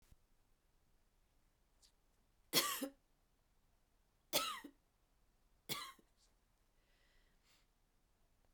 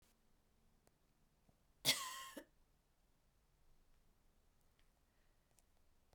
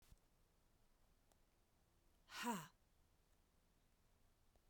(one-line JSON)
{"three_cough_length": "8.5 s", "three_cough_amplitude": 3209, "three_cough_signal_mean_std_ratio": 0.25, "cough_length": "6.1 s", "cough_amplitude": 3128, "cough_signal_mean_std_ratio": 0.22, "exhalation_length": "4.7 s", "exhalation_amplitude": 871, "exhalation_signal_mean_std_ratio": 0.29, "survey_phase": "beta (2021-08-13 to 2022-03-07)", "age": "45-64", "gender": "Female", "wearing_mask": "No", "symptom_cough_any": true, "symptom_runny_or_blocked_nose": true, "symptom_sore_throat": true, "symptom_fatigue": true, "symptom_headache": true, "symptom_onset": "4 days", "smoker_status": "Ex-smoker", "respiratory_condition_asthma": false, "respiratory_condition_other": false, "recruitment_source": "Test and Trace", "submission_delay": "2 days", "covid_test_result": "Positive", "covid_test_method": "RT-qPCR", "covid_ct_value": 18.5, "covid_ct_gene": "N gene", "covid_ct_mean": 19.4, "covid_viral_load": "440000 copies/ml", "covid_viral_load_category": "Low viral load (10K-1M copies/ml)"}